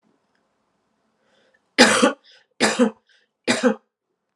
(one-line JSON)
{"three_cough_length": "4.4 s", "three_cough_amplitude": 32767, "three_cough_signal_mean_std_ratio": 0.33, "survey_phase": "alpha (2021-03-01 to 2021-08-12)", "age": "45-64", "gender": "Female", "wearing_mask": "No", "symptom_cough_any": true, "symptom_headache": true, "symptom_onset": "3 days", "smoker_status": "Ex-smoker", "respiratory_condition_asthma": false, "respiratory_condition_other": false, "recruitment_source": "Test and Trace", "submission_delay": "2 days", "covid_test_result": "Positive", "covid_test_method": "RT-qPCR", "covid_ct_value": 19.6, "covid_ct_gene": "ORF1ab gene", "covid_ct_mean": 20.9, "covid_viral_load": "140000 copies/ml", "covid_viral_load_category": "Low viral load (10K-1M copies/ml)"}